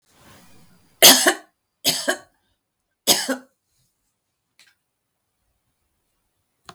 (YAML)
three_cough_length: 6.7 s
three_cough_amplitude: 32768
three_cough_signal_mean_std_ratio: 0.23
survey_phase: beta (2021-08-13 to 2022-03-07)
age: 65+
gender: Female
wearing_mask: 'No'
symptom_none: true
smoker_status: Never smoked
respiratory_condition_asthma: false
respiratory_condition_other: false
recruitment_source: REACT
submission_delay: 1 day
covid_test_result: Negative
covid_test_method: RT-qPCR